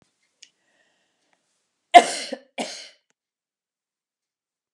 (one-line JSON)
{"cough_length": "4.7 s", "cough_amplitude": 32768, "cough_signal_mean_std_ratio": 0.14, "survey_phase": "alpha (2021-03-01 to 2021-08-12)", "age": "65+", "gender": "Female", "wearing_mask": "No", "symptom_none": true, "smoker_status": "Ex-smoker", "respiratory_condition_asthma": false, "respiratory_condition_other": false, "recruitment_source": "REACT", "submission_delay": "3 days", "covid_test_result": "Negative", "covid_test_method": "RT-qPCR"}